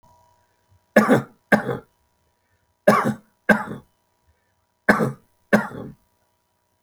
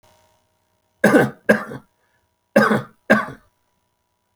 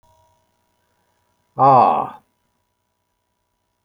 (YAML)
three_cough_length: 6.8 s
three_cough_amplitude: 27891
three_cough_signal_mean_std_ratio: 0.32
cough_length: 4.4 s
cough_amplitude: 29473
cough_signal_mean_std_ratio: 0.34
exhalation_length: 3.8 s
exhalation_amplitude: 27403
exhalation_signal_mean_std_ratio: 0.28
survey_phase: beta (2021-08-13 to 2022-03-07)
age: 65+
gender: Male
wearing_mask: 'No'
symptom_none: true
smoker_status: Ex-smoker
respiratory_condition_asthma: false
respiratory_condition_other: false
recruitment_source: REACT
submission_delay: 1 day
covid_test_result: Negative
covid_test_method: RT-qPCR